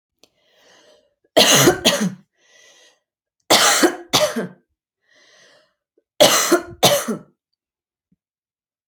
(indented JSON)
{
  "three_cough_length": "8.9 s",
  "three_cough_amplitude": 32767,
  "three_cough_signal_mean_std_ratio": 0.38,
  "survey_phase": "alpha (2021-03-01 to 2021-08-12)",
  "age": "18-44",
  "gender": "Female",
  "wearing_mask": "No",
  "symptom_none": true,
  "smoker_status": "Never smoked",
  "respiratory_condition_asthma": false,
  "respiratory_condition_other": false,
  "recruitment_source": "REACT",
  "submission_delay": "3 days",
  "covid_test_result": "Negative",
  "covid_test_method": "RT-qPCR"
}